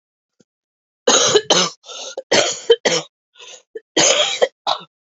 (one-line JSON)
{"three_cough_length": "5.1 s", "three_cough_amplitude": 31652, "three_cough_signal_mean_std_ratio": 0.46, "survey_phase": "beta (2021-08-13 to 2022-03-07)", "age": "45-64", "gender": "Female", "wearing_mask": "No", "symptom_cough_any": true, "symptom_new_continuous_cough": true, "symptom_runny_or_blocked_nose": true, "symptom_sore_throat": true, "symptom_abdominal_pain": true, "symptom_fatigue": true, "symptom_fever_high_temperature": true, "symptom_headache": true, "symptom_change_to_sense_of_smell_or_taste": true, "symptom_other": true, "symptom_onset": "4 days", "smoker_status": "Current smoker (e-cigarettes or vapes only)", "respiratory_condition_asthma": true, "respiratory_condition_other": false, "recruitment_source": "Test and Trace", "submission_delay": "2 days", "covid_test_result": "Positive", "covid_test_method": "RT-qPCR", "covid_ct_value": 22.6, "covid_ct_gene": "ORF1ab gene"}